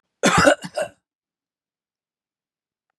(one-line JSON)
{"cough_length": "3.0 s", "cough_amplitude": 25251, "cough_signal_mean_std_ratio": 0.29, "survey_phase": "beta (2021-08-13 to 2022-03-07)", "age": "45-64", "gender": "Male", "wearing_mask": "No", "symptom_none": true, "smoker_status": "Ex-smoker", "respiratory_condition_asthma": false, "respiratory_condition_other": false, "recruitment_source": "REACT", "submission_delay": "1 day", "covid_test_result": "Negative", "covid_test_method": "RT-qPCR", "influenza_a_test_result": "Negative", "influenza_b_test_result": "Negative"}